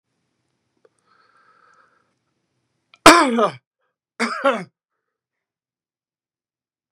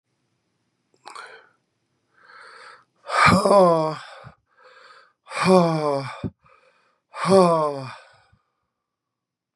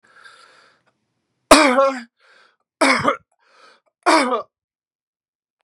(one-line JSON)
{"cough_length": "6.9 s", "cough_amplitude": 32768, "cough_signal_mean_std_ratio": 0.22, "exhalation_length": "9.6 s", "exhalation_amplitude": 27043, "exhalation_signal_mean_std_ratio": 0.37, "three_cough_length": "5.6 s", "three_cough_amplitude": 32768, "three_cough_signal_mean_std_ratio": 0.33, "survey_phase": "beta (2021-08-13 to 2022-03-07)", "age": "65+", "gender": "Male", "wearing_mask": "No", "symptom_cough_any": true, "symptom_fatigue": true, "symptom_onset": "5 days", "smoker_status": "Ex-smoker", "respiratory_condition_asthma": false, "respiratory_condition_other": false, "recruitment_source": "Test and Trace", "submission_delay": "2 days", "covid_test_result": "Positive", "covid_test_method": "ePCR"}